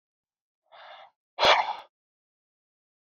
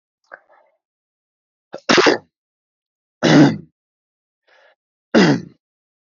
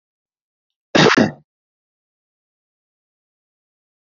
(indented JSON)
{
  "exhalation_length": "3.2 s",
  "exhalation_amplitude": 21555,
  "exhalation_signal_mean_std_ratio": 0.25,
  "three_cough_length": "6.1 s",
  "three_cough_amplitude": 28726,
  "three_cough_signal_mean_std_ratio": 0.3,
  "cough_length": "4.0 s",
  "cough_amplitude": 29938,
  "cough_signal_mean_std_ratio": 0.22,
  "survey_phase": "beta (2021-08-13 to 2022-03-07)",
  "age": "18-44",
  "gender": "Male",
  "wearing_mask": "No",
  "symptom_sore_throat": true,
  "symptom_fatigue": true,
  "symptom_onset": "4 days",
  "smoker_status": "Never smoked",
  "respiratory_condition_asthma": false,
  "respiratory_condition_other": false,
  "recruitment_source": "Test and Trace",
  "submission_delay": "1 day",
  "covid_test_result": "Positive",
  "covid_test_method": "RT-qPCR",
  "covid_ct_value": 28.3,
  "covid_ct_gene": "N gene"
}